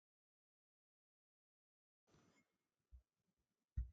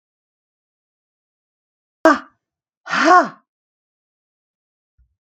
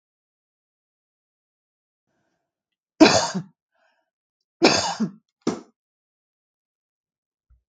{"cough_length": "3.9 s", "cough_amplitude": 663, "cough_signal_mean_std_ratio": 0.15, "exhalation_length": "5.2 s", "exhalation_amplitude": 32767, "exhalation_signal_mean_std_ratio": 0.23, "three_cough_length": "7.7 s", "three_cough_amplitude": 32766, "three_cough_signal_mean_std_ratio": 0.22, "survey_phase": "beta (2021-08-13 to 2022-03-07)", "age": "45-64", "gender": "Female", "wearing_mask": "No", "symptom_none": true, "smoker_status": "Never smoked", "respiratory_condition_asthma": false, "respiratory_condition_other": false, "recruitment_source": "REACT", "submission_delay": "1 day", "covid_test_result": "Negative", "covid_test_method": "RT-qPCR", "influenza_a_test_result": "Negative", "influenza_b_test_result": "Negative"}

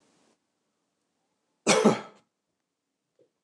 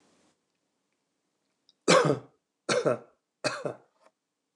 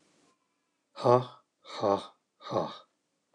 {"cough_length": "3.4 s", "cough_amplitude": 14367, "cough_signal_mean_std_ratio": 0.23, "three_cough_length": "4.6 s", "three_cough_amplitude": 14099, "three_cough_signal_mean_std_ratio": 0.3, "exhalation_length": "3.3 s", "exhalation_amplitude": 12199, "exhalation_signal_mean_std_ratio": 0.32, "survey_phase": "beta (2021-08-13 to 2022-03-07)", "age": "45-64", "gender": "Male", "wearing_mask": "No", "symptom_none": true, "smoker_status": "Never smoked", "respiratory_condition_asthma": false, "respiratory_condition_other": false, "recruitment_source": "REACT", "submission_delay": "1 day", "covid_test_result": "Negative", "covid_test_method": "RT-qPCR"}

